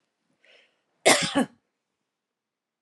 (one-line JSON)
{"cough_length": "2.8 s", "cough_amplitude": 23888, "cough_signal_mean_std_ratio": 0.26, "survey_phase": "alpha (2021-03-01 to 2021-08-12)", "age": "45-64", "gender": "Female", "wearing_mask": "No", "symptom_none": true, "smoker_status": "Ex-smoker", "respiratory_condition_asthma": false, "respiratory_condition_other": false, "recruitment_source": "REACT", "submission_delay": "1 day", "covid_test_result": "Negative", "covid_test_method": "RT-qPCR"}